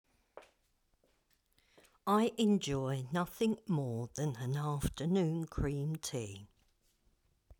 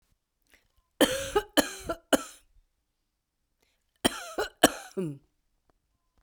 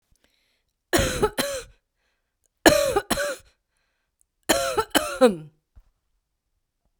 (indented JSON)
{
  "exhalation_length": "7.6 s",
  "exhalation_amplitude": 3028,
  "exhalation_signal_mean_std_ratio": 0.62,
  "cough_length": "6.2 s",
  "cough_amplitude": 24059,
  "cough_signal_mean_std_ratio": 0.27,
  "three_cough_length": "7.0 s",
  "three_cough_amplitude": 32768,
  "three_cough_signal_mean_std_ratio": 0.36,
  "survey_phase": "beta (2021-08-13 to 2022-03-07)",
  "age": "45-64",
  "gender": "Female",
  "wearing_mask": "No",
  "symptom_none": true,
  "smoker_status": "Current smoker (1 to 10 cigarettes per day)",
  "respiratory_condition_asthma": false,
  "respiratory_condition_other": false,
  "recruitment_source": "REACT",
  "submission_delay": "1 day",
  "covid_test_result": "Negative",
  "covid_test_method": "RT-qPCR"
}